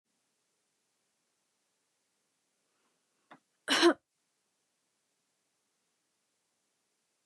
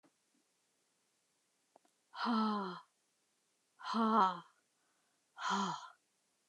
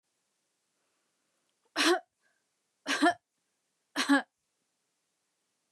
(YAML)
cough_length: 7.3 s
cough_amplitude: 8345
cough_signal_mean_std_ratio: 0.15
exhalation_length: 6.5 s
exhalation_amplitude: 4345
exhalation_signal_mean_std_ratio: 0.38
three_cough_length: 5.7 s
three_cough_amplitude: 8546
three_cough_signal_mean_std_ratio: 0.27
survey_phase: beta (2021-08-13 to 2022-03-07)
age: 45-64
gender: Female
wearing_mask: 'No'
symptom_none: true
smoker_status: Ex-smoker
respiratory_condition_asthma: false
respiratory_condition_other: false
recruitment_source: REACT
submission_delay: 2 days
covid_test_result: Negative
covid_test_method: RT-qPCR
influenza_a_test_result: Negative
influenza_b_test_result: Negative